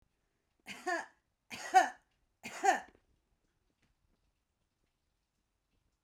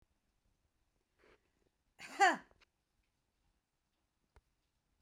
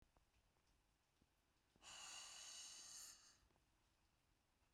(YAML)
three_cough_length: 6.0 s
three_cough_amplitude: 6480
three_cough_signal_mean_std_ratio: 0.23
cough_length: 5.0 s
cough_amplitude: 4495
cough_signal_mean_std_ratio: 0.16
exhalation_length: 4.7 s
exhalation_amplitude: 177
exhalation_signal_mean_std_ratio: 0.56
survey_phase: beta (2021-08-13 to 2022-03-07)
age: 45-64
gender: Female
wearing_mask: 'No'
symptom_none: true
smoker_status: Prefer not to say
respiratory_condition_asthma: false
respiratory_condition_other: false
recruitment_source: REACT
submission_delay: 3 days
covid_test_result: Negative
covid_test_method: RT-qPCR